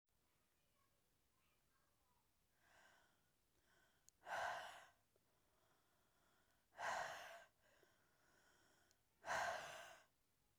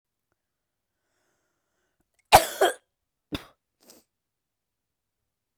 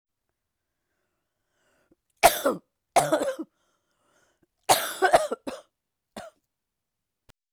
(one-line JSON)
{"exhalation_length": "10.6 s", "exhalation_amplitude": 661, "exhalation_signal_mean_std_ratio": 0.35, "cough_length": "5.6 s", "cough_amplitude": 27239, "cough_signal_mean_std_ratio": 0.16, "three_cough_length": "7.5 s", "three_cough_amplitude": 30217, "three_cough_signal_mean_std_ratio": 0.28, "survey_phase": "beta (2021-08-13 to 2022-03-07)", "age": "45-64", "gender": "Female", "wearing_mask": "No", "symptom_cough_any": true, "symptom_sore_throat": true, "symptom_fatigue": true, "symptom_headache": true, "symptom_other": true, "symptom_onset": "3 days", "smoker_status": "Never smoked", "respiratory_condition_asthma": false, "respiratory_condition_other": false, "recruitment_source": "Test and Trace", "submission_delay": "1 day", "covid_test_result": "Positive", "covid_test_method": "RT-qPCR", "covid_ct_value": 29.8, "covid_ct_gene": "N gene", "covid_ct_mean": 29.9, "covid_viral_load": "150 copies/ml", "covid_viral_load_category": "Minimal viral load (< 10K copies/ml)"}